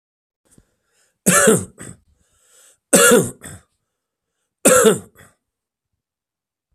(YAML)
three_cough_length: 6.7 s
three_cough_amplitude: 32768
three_cough_signal_mean_std_ratio: 0.33
survey_phase: beta (2021-08-13 to 2022-03-07)
age: 45-64
gender: Male
wearing_mask: 'No'
symptom_cough_any: true
symptom_runny_or_blocked_nose: true
symptom_shortness_of_breath: true
symptom_sore_throat: true
symptom_fatigue: true
symptom_headache: true
symptom_onset: 3 days
smoker_status: Never smoked
respiratory_condition_asthma: false
respiratory_condition_other: false
recruitment_source: Test and Trace
submission_delay: 1 day
covid_test_result: Positive
covid_test_method: ePCR